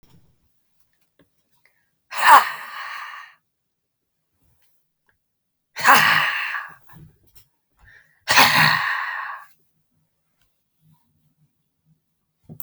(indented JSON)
{
  "exhalation_length": "12.6 s",
  "exhalation_amplitude": 32767,
  "exhalation_signal_mean_std_ratio": 0.3,
  "survey_phase": "beta (2021-08-13 to 2022-03-07)",
  "age": "45-64",
  "gender": "Female",
  "wearing_mask": "No",
  "symptom_cough_any": true,
  "symptom_onset": "11 days",
  "smoker_status": "Ex-smoker",
  "respiratory_condition_asthma": true,
  "respiratory_condition_other": false,
  "recruitment_source": "REACT",
  "submission_delay": "7 days",
  "covid_test_result": "Negative",
  "covid_test_method": "RT-qPCR"
}